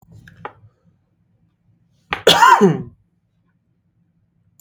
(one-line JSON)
{"cough_length": "4.6 s", "cough_amplitude": 32768, "cough_signal_mean_std_ratio": 0.28, "survey_phase": "beta (2021-08-13 to 2022-03-07)", "age": "18-44", "gender": "Male", "wearing_mask": "Yes", "symptom_none": true, "smoker_status": "Never smoked", "respiratory_condition_asthma": false, "respiratory_condition_other": false, "recruitment_source": "REACT", "submission_delay": "0 days", "covid_test_result": "Negative", "covid_test_method": "RT-qPCR", "influenza_a_test_result": "Negative", "influenza_b_test_result": "Negative"}